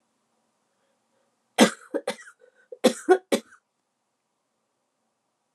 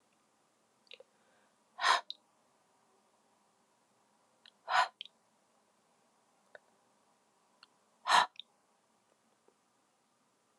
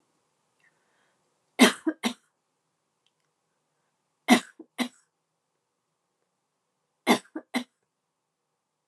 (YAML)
cough_length: 5.5 s
cough_amplitude: 24324
cough_signal_mean_std_ratio: 0.21
exhalation_length: 10.6 s
exhalation_amplitude: 7046
exhalation_signal_mean_std_ratio: 0.19
three_cough_length: 8.9 s
three_cough_amplitude: 22789
three_cough_signal_mean_std_ratio: 0.19
survey_phase: beta (2021-08-13 to 2022-03-07)
age: 65+
gender: Female
wearing_mask: 'No'
symptom_cough_any: true
symptom_runny_or_blocked_nose: true
symptom_diarrhoea: true
symptom_fatigue: true
symptom_headache: true
symptom_change_to_sense_of_smell_or_taste: true
smoker_status: Never smoked
respiratory_condition_asthma: false
respiratory_condition_other: false
recruitment_source: Test and Trace
submission_delay: 1 day
covid_test_result: Positive
covid_test_method: RT-qPCR
covid_ct_value: 20.0
covid_ct_gene: ORF1ab gene